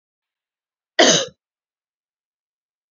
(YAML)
cough_length: 2.9 s
cough_amplitude: 29337
cough_signal_mean_std_ratio: 0.23
survey_phase: beta (2021-08-13 to 2022-03-07)
age: 45-64
gender: Female
wearing_mask: 'No'
symptom_runny_or_blocked_nose: true
smoker_status: Never smoked
respiratory_condition_asthma: false
respiratory_condition_other: false
recruitment_source: REACT
submission_delay: 2 days
covid_test_result: Negative
covid_test_method: RT-qPCR